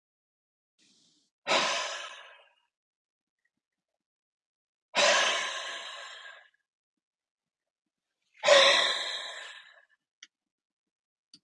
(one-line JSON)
{"exhalation_length": "11.4 s", "exhalation_amplitude": 14008, "exhalation_signal_mean_std_ratio": 0.32, "survey_phase": "beta (2021-08-13 to 2022-03-07)", "age": "45-64", "gender": "Male", "wearing_mask": "No", "symptom_cough_any": true, "symptom_sore_throat": true, "symptom_fatigue": true, "symptom_change_to_sense_of_smell_or_taste": true, "symptom_onset": "7 days", "smoker_status": "Ex-smoker", "respiratory_condition_asthma": false, "respiratory_condition_other": false, "recruitment_source": "Test and Trace", "submission_delay": "1 day", "covid_test_result": "Positive", "covid_test_method": "RT-qPCR", "covid_ct_value": 17.0, "covid_ct_gene": "N gene"}